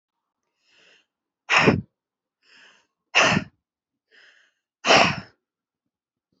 exhalation_length: 6.4 s
exhalation_amplitude: 25816
exhalation_signal_mean_std_ratio: 0.29
survey_phase: alpha (2021-03-01 to 2021-08-12)
age: 18-44
gender: Female
wearing_mask: 'No'
symptom_cough_any: true
symptom_shortness_of_breath: true
symptom_diarrhoea: true
symptom_fatigue: true
symptom_headache: true
symptom_change_to_sense_of_smell_or_taste: true
symptom_loss_of_taste: true
symptom_onset: 4 days
smoker_status: Current smoker (11 or more cigarettes per day)
respiratory_condition_asthma: false
respiratory_condition_other: false
recruitment_source: Test and Trace
submission_delay: 2 days
covid_test_result: Positive
covid_test_method: RT-qPCR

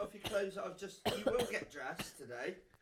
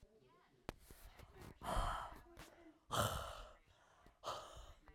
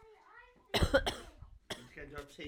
three_cough_length: 2.8 s
three_cough_amplitude: 3594
three_cough_signal_mean_std_ratio: 0.71
exhalation_length: 4.9 s
exhalation_amplitude: 1829
exhalation_signal_mean_std_ratio: 0.48
cough_length: 2.5 s
cough_amplitude: 6736
cough_signal_mean_std_ratio: 0.39
survey_phase: alpha (2021-03-01 to 2021-08-12)
age: 18-44
gender: Female
wearing_mask: 'No'
symptom_cough_any: true
symptom_shortness_of_breath: true
symptom_fatigue: true
symptom_headache: true
smoker_status: Never smoked
respiratory_condition_asthma: false
respiratory_condition_other: false
recruitment_source: Test and Trace
submission_delay: 3 days
covid_test_result: Positive
covid_test_method: RT-qPCR
covid_ct_value: 30.9
covid_ct_gene: ORF1ab gene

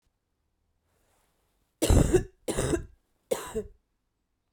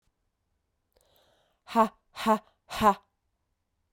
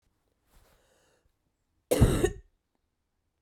three_cough_length: 4.5 s
three_cough_amplitude: 11946
three_cough_signal_mean_std_ratio: 0.33
exhalation_length: 3.9 s
exhalation_amplitude: 11745
exhalation_signal_mean_std_ratio: 0.27
cough_length: 3.4 s
cough_amplitude: 13840
cough_signal_mean_std_ratio: 0.26
survey_phase: beta (2021-08-13 to 2022-03-07)
age: 18-44
gender: Female
wearing_mask: 'No'
symptom_cough_any: true
symptom_fatigue: true
symptom_change_to_sense_of_smell_or_taste: true
symptom_loss_of_taste: true
symptom_onset: 3 days
smoker_status: Never smoked
respiratory_condition_asthma: true
respiratory_condition_other: false
recruitment_source: Test and Trace
submission_delay: 2 days
covid_test_result: Positive
covid_test_method: RT-qPCR
covid_ct_value: 18.1
covid_ct_gene: N gene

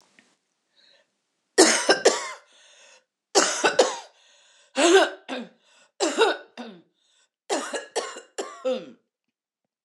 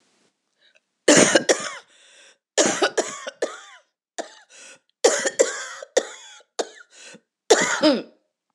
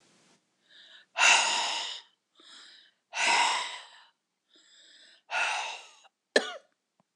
three_cough_length: 9.8 s
three_cough_amplitude: 24614
three_cough_signal_mean_std_ratio: 0.38
cough_length: 8.5 s
cough_amplitude: 26028
cough_signal_mean_std_ratio: 0.38
exhalation_length: 7.2 s
exhalation_amplitude: 15143
exhalation_signal_mean_std_ratio: 0.4
survey_phase: beta (2021-08-13 to 2022-03-07)
age: 45-64
gender: Female
wearing_mask: 'No'
symptom_cough_any: true
symptom_runny_or_blocked_nose: true
symptom_shortness_of_breath: true
symptom_sore_throat: true
symptom_fatigue: true
symptom_headache: true
symptom_change_to_sense_of_smell_or_taste: true
symptom_onset: 3 days
smoker_status: Never smoked
respiratory_condition_asthma: false
respiratory_condition_other: false
recruitment_source: Test and Trace
submission_delay: 1 day
covid_test_result: Positive
covid_test_method: RT-qPCR
covid_ct_value: 24.6
covid_ct_gene: N gene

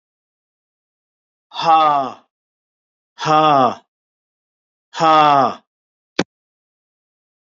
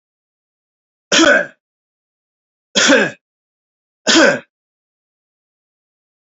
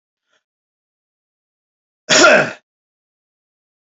exhalation_length: 7.6 s
exhalation_amplitude: 28957
exhalation_signal_mean_std_ratio: 0.35
three_cough_length: 6.2 s
three_cough_amplitude: 31095
three_cough_signal_mean_std_ratio: 0.32
cough_length: 3.9 s
cough_amplitude: 32137
cough_signal_mean_std_ratio: 0.25
survey_phase: beta (2021-08-13 to 2022-03-07)
age: 45-64
gender: Male
wearing_mask: 'No'
symptom_runny_or_blocked_nose: true
smoker_status: Never smoked
respiratory_condition_asthma: false
respiratory_condition_other: false
recruitment_source: REACT
submission_delay: 2 days
covid_test_result: Negative
covid_test_method: RT-qPCR
influenza_a_test_result: Negative
influenza_b_test_result: Negative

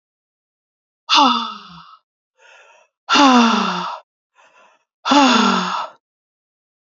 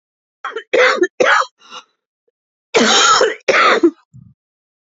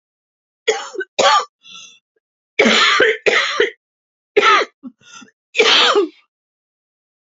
exhalation_length: 7.0 s
exhalation_amplitude: 31257
exhalation_signal_mean_std_ratio: 0.43
cough_length: 4.9 s
cough_amplitude: 32644
cough_signal_mean_std_ratio: 0.51
three_cough_length: 7.3 s
three_cough_amplitude: 32767
three_cough_signal_mean_std_ratio: 0.47
survey_phase: beta (2021-08-13 to 2022-03-07)
age: 45-64
gender: Female
wearing_mask: 'No'
symptom_cough_any: true
symptom_headache: true
symptom_change_to_sense_of_smell_or_taste: true
symptom_onset: 8 days
smoker_status: Never smoked
respiratory_condition_asthma: false
respiratory_condition_other: false
recruitment_source: REACT
submission_delay: 1 day
covid_test_result: Negative
covid_test_method: RT-qPCR
influenza_a_test_result: Negative
influenza_b_test_result: Negative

